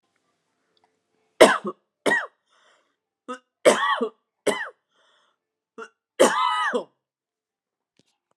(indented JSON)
{
  "three_cough_length": "8.4 s",
  "three_cough_amplitude": 32768,
  "three_cough_signal_mean_std_ratio": 0.3,
  "survey_phase": "alpha (2021-03-01 to 2021-08-12)",
  "age": "45-64",
  "gender": "Female",
  "wearing_mask": "No",
  "symptom_cough_any": true,
  "symptom_abdominal_pain": true,
  "symptom_onset": "12 days",
  "smoker_status": "Never smoked",
  "respiratory_condition_asthma": false,
  "respiratory_condition_other": false,
  "recruitment_source": "REACT",
  "submission_delay": "33 days",
  "covid_test_result": "Negative",
  "covid_test_method": "RT-qPCR"
}